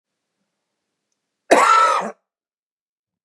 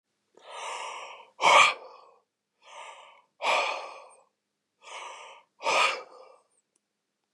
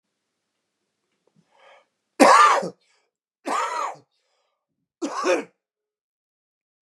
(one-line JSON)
{"cough_length": "3.2 s", "cough_amplitude": 32768, "cough_signal_mean_std_ratio": 0.34, "exhalation_length": "7.3 s", "exhalation_amplitude": 18393, "exhalation_signal_mean_std_ratio": 0.34, "three_cough_length": "6.8 s", "three_cough_amplitude": 32613, "three_cough_signal_mean_std_ratio": 0.29, "survey_phase": "beta (2021-08-13 to 2022-03-07)", "age": "45-64", "gender": "Male", "wearing_mask": "No", "symptom_cough_any": true, "symptom_runny_or_blocked_nose": true, "symptom_headache": true, "smoker_status": "Ex-smoker", "respiratory_condition_asthma": false, "respiratory_condition_other": false, "recruitment_source": "Test and Trace", "submission_delay": "2 days", "covid_test_result": "Positive", "covid_test_method": "RT-qPCR", "covid_ct_value": 23.2, "covid_ct_gene": "ORF1ab gene", "covid_ct_mean": 23.4, "covid_viral_load": "21000 copies/ml", "covid_viral_load_category": "Low viral load (10K-1M copies/ml)"}